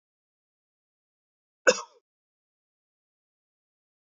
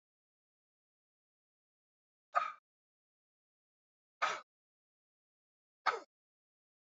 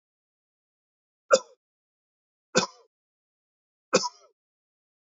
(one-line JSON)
{"cough_length": "4.0 s", "cough_amplitude": 14615, "cough_signal_mean_std_ratio": 0.11, "exhalation_length": "6.9 s", "exhalation_amplitude": 4987, "exhalation_signal_mean_std_ratio": 0.18, "three_cough_length": "5.1 s", "three_cough_amplitude": 20195, "three_cough_signal_mean_std_ratio": 0.17, "survey_phase": "beta (2021-08-13 to 2022-03-07)", "age": "45-64", "gender": "Male", "wearing_mask": "No", "symptom_none": true, "smoker_status": "Ex-smoker", "respiratory_condition_asthma": false, "respiratory_condition_other": false, "recruitment_source": "REACT", "submission_delay": "1 day", "covid_test_result": "Negative", "covid_test_method": "RT-qPCR", "influenza_a_test_result": "Negative", "influenza_b_test_result": "Negative"}